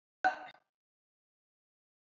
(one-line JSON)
{"cough_length": "2.1 s", "cough_amplitude": 4261, "cough_signal_mean_std_ratio": 0.19, "survey_phase": "beta (2021-08-13 to 2022-03-07)", "age": "65+", "gender": "Female", "wearing_mask": "No", "symptom_none": true, "smoker_status": "Never smoked", "respiratory_condition_asthma": false, "respiratory_condition_other": false, "recruitment_source": "Test and Trace", "submission_delay": "0 days", "covid_test_result": "Negative", "covid_test_method": "LFT"}